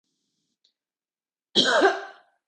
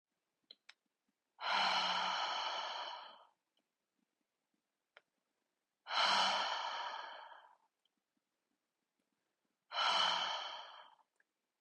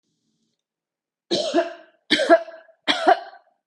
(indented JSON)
{
  "cough_length": "2.5 s",
  "cough_amplitude": 17909,
  "cough_signal_mean_std_ratio": 0.34,
  "exhalation_length": "11.6 s",
  "exhalation_amplitude": 3026,
  "exhalation_signal_mean_std_ratio": 0.46,
  "three_cough_length": "3.7 s",
  "three_cough_amplitude": 26330,
  "three_cough_signal_mean_std_ratio": 0.37,
  "survey_phase": "beta (2021-08-13 to 2022-03-07)",
  "age": "18-44",
  "gender": "Female",
  "wearing_mask": "No",
  "symptom_headache": true,
  "symptom_onset": "12 days",
  "smoker_status": "Never smoked",
  "respiratory_condition_asthma": false,
  "respiratory_condition_other": false,
  "recruitment_source": "REACT",
  "submission_delay": "0 days",
  "covid_test_result": "Negative",
  "covid_test_method": "RT-qPCR",
  "influenza_a_test_result": "Negative",
  "influenza_b_test_result": "Negative"
}